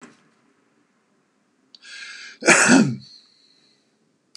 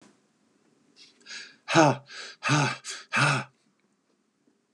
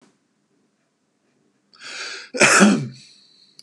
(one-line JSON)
{"cough_length": "4.4 s", "cough_amplitude": 31820, "cough_signal_mean_std_ratio": 0.29, "exhalation_length": "4.7 s", "exhalation_amplitude": 20876, "exhalation_signal_mean_std_ratio": 0.36, "three_cough_length": "3.6 s", "three_cough_amplitude": 31168, "three_cough_signal_mean_std_ratio": 0.33, "survey_phase": "beta (2021-08-13 to 2022-03-07)", "age": "45-64", "gender": "Male", "wearing_mask": "No", "symptom_none": true, "smoker_status": "Current smoker (1 to 10 cigarettes per day)", "respiratory_condition_asthma": false, "respiratory_condition_other": false, "recruitment_source": "REACT", "submission_delay": "3 days", "covid_test_result": "Negative", "covid_test_method": "RT-qPCR", "influenza_a_test_result": "Negative", "influenza_b_test_result": "Negative"}